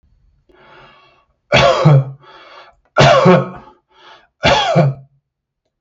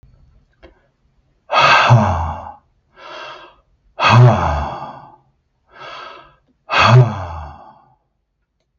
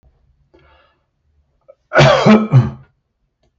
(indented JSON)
{
  "three_cough_length": "5.8 s",
  "three_cough_amplitude": 32768,
  "three_cough_signal_mean_std_ratio": 0.45,
  "exhalation_length": "8.8 s",
  "exhalation_amplitude": 32768,
  "exhalation_signal_mean_std_ratio": 0.41,
  "cough_length": "3.6 s",
  "cough_amplitude": 32768,
  "cough_signal_mean_std_ratio": 0.36,
  "survey_phase": "beta (2021-08-13 to 2022-03-07)",
  "age": "45-64",
  "gender": "Male",
  "wearing_mask": "No",
  "symptom_none": true,
  "smoker_status": "Never smoked",
  "respiratory_condition_asthma": false,
  "respiratory_condition_other": false,
  "recruitment_source": "REACT",
  "submission_delay": "3 days",
  "covid_test_result": "Negative",
  "covid_test_method": "RT-qPCR",
  "influenza_a_test_result": "Negative",
  "influenza_b_test_result": "Negative"
}